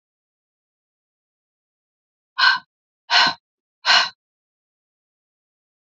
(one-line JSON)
{"exhalation_length": "6.0 s", "exhalation_amplitude": 27547, "exhalation_signal_mean_std_ratio": 0.25, "survey_phase": "alpha (2021-03-01 to 2021-08-12)", "age": "45-64", "gender": "Female", "wearing_mask": "No", "symptom_none": true, "smoker_status": "Ex-smoker", "respiratory_condition_asthma": true, "respiratory_condition_other": false, "recruitment_source": "REACT", "submission_delay": "8 days", "covid_test_result": "Negative", "covid_test_method": "RT-qPCR"}